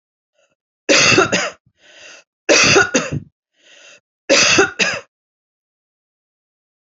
{"three_cough_length": "6.8 s", "three_cough_amplitude": 30729, "three_cough_signal_mean_std_ratio": 0.42, "survey_phase": "alpha (2021-03-01 to 2021-08-12)", "age": "45-64", "gender": "Female", "wearing_mask": "No", "symptom_none": true, "symptom_onset": "8 days", "smoker_status": "Never smoked", "respiratory_condition_asthma": false, "respiratory_condition_other": false, "recruitment_source": "REACT", "submission_delay": "4 days", "covid_test_result": "Negative", "covid_test_method": "RT-qPCR"}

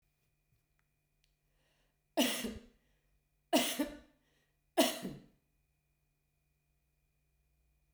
{"three_cough_length": "7.9 s", "three_cough_amplitude": 6504, "three_cough_signal_mean_std_ratio": 0.26, "survey_phase": "beta (2021-08-13 to 2022-03-07)", "age": "65+", "gender": "Female", "wearing_mask": "No", "symptom_none": true, "smoker_status": "Never smoked", "respiratory_condition_asthma": false, "respiratory_condition_other": false, "recruitment_source": "REACT", "submission_delay": "1 day", "covid_test_result": "Negative", "covid_test_method": "RT-qPCR", "influenza_a_test_result": "Negative", "influenza_b_test_result": "Negative"}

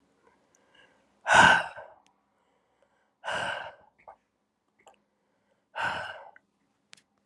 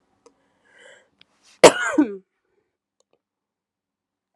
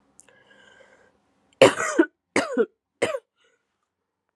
{"exhalation_length": "7.3 s", "exhalation_amplitude": 21030, "exhalation_signal_mean_std_ratio": 0.25, "cough_length": "4.4 s", "cough_amplitude": 32768, "cough_signal_mean_std_ratio": 0.18, "three_cough_length": "4.4 s", "three_cough_amplitude": 31327, "three_cough_signal_mean_std_ratio": 0.27, "survey_phase": "alpha (2021-03-01 to 2021-08-12)", "age": "18-44", "gender": "Female", "wearing_mask": "No", "symptom_cough_any": true, "symptom_new_continuous_cough": true, "symptom_shortness_of_breath": true, "symptom_diarrhoea": true, "symptom_fatigue": true, "symptom_headache": true, "symptom_change_to_sense_of_smell_or_taste": true, "symptom_onset": "6 days", "smoker_status": "Ex-smoker", "respiratory_condition_asthma": false, "respiratory_condition_other": false, "recruitment_source": "Test and Trace", "submission_delay": "1 day", "covid_test_result": "Positive", "covid_test_method": "RT-qPCR", "covid_ct_value": 17.5, "covid_ct_gene": "ORF1ab gene"}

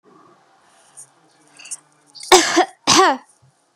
{"three_cough_length": "3.8 s", "three_cough_amplitude": 32768, "three_cough_signal_mean_std_ratio": 0.33, "survey_phase": "beta (2021-08-13 to 2022-03-07)", "age": "18-44", "gender": "Female", "wearing_mask": "No", "symptom_none": true, "smoker_status": "Never smoked", "respiratory_condition_asthma": false, "respiratory_condition_other": false, "recruitment_source": "REACT", "submission_delay": "2 days", "covid_test_result": "Negative", "covid_test_method": "RT-qPCR", "influenza_a_test_result": "Negative", "influenza_b_test_result": "Negative"}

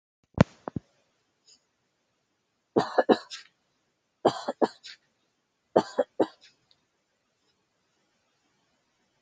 {"three_cough_length": "9.2 s", "three_cough_amplitude": 24776, "three_cough_signal_mean_std_ratio": 0.2, "survey_phase": "beta (2021-08-13 to 2022-03-07)", "age": "18-44", "gender": "Female", "wearing_mask": "No", "symptom_runny_or_blocked_nose": true, "symptom_fatigue": true, "smoker_status": "Never smoked", "respiratory_condition_asthma": false, "respiratory_condition_other": false, "recruitment_source": "Test and Trace", "submission_delay": "2 days", "covid_test_result": "Positive", "covid_test_method": "ePCR"}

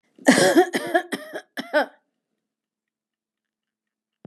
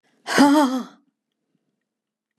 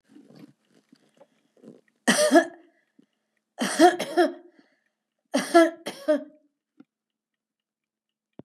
{"cough_length": "4.3 s", "cough_amplitude": 30728, "cough_signal_mean_std_ratio": 0.34, "exhalation_length": "2.4 s", "exhalation_amplitude": 24459, "exhalation_signal_mean_std_ratio": 0.37, "three_cough_length": "8.4 s", "three_cough_amplitude": 23671, "three_cough_signal_mean_std_ratio": 0.3, "survey_phase": "beta (2021-08-13 to 2022-03-07)", "age": "65+", "gender": "Female", "wearing_mask": "No", "symptom_none": true, "smoker_status": "Never smoked", "respiratory_condition_asthma": false, "respiratory_condition_other": false, "recruitment_source": "REACT", "submission_delay": "2 days", "covid_test_result": "Negative", "covid_test_method": "RT-qPCR", "influenza_a_test_result": "Negative", "influenza_b_test_result": "Negative"}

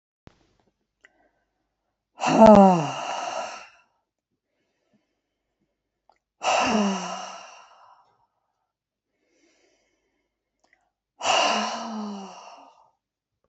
{"exhalation_length": "13.5 s", "exhalation_amplitude": 27106, "exhalation_signal_mean_std_ratio": 0.29, "survey_phase": "alpha (2021-03-01 to 2021-08-12)", "age": "65+", "gender": "Female", "wearing_mask": "No", "symptom_none": true, "smoker_status": "Ex-smoker", "respiratory_condition_asthma": false, "respiratory_condition_other": false, "recruitment_source": "REACT", "submission_delay": "2 days", "covid_test_result": "Negative", "covid_test_method": "RT-qPCR"}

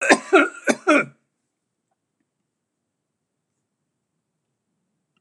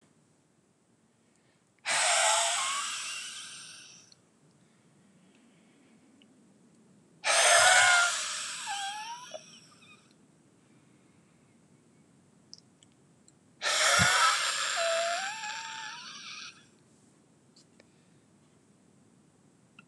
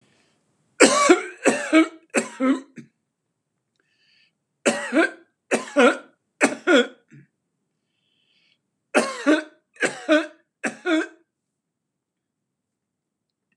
{"cough_length": "5.2 s", "cough_amplitude": 32482, "cough_signal_mean_std_ratio": 0.25, "exhalation_length": "19.9 s", "exhalation_amplitude": 12988, "exhalation_signal_mean_std_ratio": 0.41, "three_cough_length": "13.6 s", "three_cough_amplitude": 32767, "three_cough_signal_mean_std_ratio": 0.35, "survey_phase": "beta (2021-08-13 to 2022-03-07)", "age": "65+", "gender": "Male", "wearing_mask": "No", "symptom_none": true, "smoker_status": "Ex-smoker", "respiratory_condition_asthma": false, "respiratory_condition_other": false, "recruitment_source": "REACT", "submission_delay": "5 days", "covid_test_result": "Negative", "covid_test_method": "RT-qPCR"}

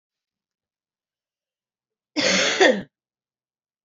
{"cough_length": "3.8 s", "cough_amplitude": 23739, "cough_signal_mean_std_ratio": 0.31, "survey_phase": "beta (2021-08-13 to 2022-03-07)", "age": "18-44", "gender": "Female", "wearing_mask": "No", "symptom_cough_any": true, "symptom_new_continuous_cough": true, "symptom_sore_throat": true, "symptom_fatigue": true, "symptom_headache": true, "symptom_onset": "3 days", "smoker_status": "Never smoked", "respiratory_condition_asthma": false, "respiratory_condition_other": false, "recruitment_source": "Test and Trace", "submission_delay": "1 day", "covid_test_result": "Positive", "covid_test_method": "ePCR"}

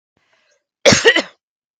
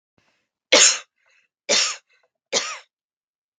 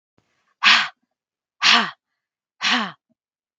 {"cough_length": "1.8 s", "cough_amplitude": 32768, "cough_signal_mean_std_ratio": 0.33, "three_cough_length": "3.6 s", "three_cough_amplitude": 32767, "three_cough_signal_mean_std_ratio": 0.31, "exhalation_length": "3.6 s", "exhalation_amplitude": 32766, "exhalation_signal_mean_std_ratio": 0.35, "survey_phase": "beta (2021-08-13 to 2022-03-07)", "age": "18-44", "gender": "Female", "wearing_mask": "No", "symptom_headache": true, "smoker_status": "Never smoked", "respiratory_condition_asthma": false, "respiratory_condition_other": false, "recruitment_source": "REACT", "submission_delay": "4 days", "covid_test_result": "Negative", "covid_test_method": "RT-qPCR"}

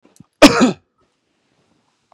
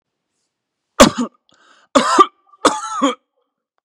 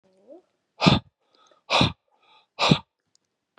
{"cough_length": "2.1 s", "cough_amplitude": 32768, "cough_signal_mean_std_ratio": 0.27, "three_cough_length": "3.8 s", "three_cough_amplitude": 32768, "three_cough_signal_mean_std_ratio": 0.33, "exhalation_length": "3.6 s", "exhalation_amplitude": 29268, "exhalation_signal_mean_std_ratio": 0.3, "survey_phase": "beta (2021-08-13 to 2022-03-07)", "age": "18-44", "gender": "Male", "wearing_mask": "No", "symptom_none": true, "smoker_status": "Never smoked", "respiratory_condition_asthma": false, "respiratory_condition_other": false, "recruitment_source": "REACT", "submission_delay": "2 days", "covid_test_result": "Negative", "covid_test_method": "RT-qPCR", "influenza_a_test_result": "Negative", "influenza_b_test_result": "Negative"}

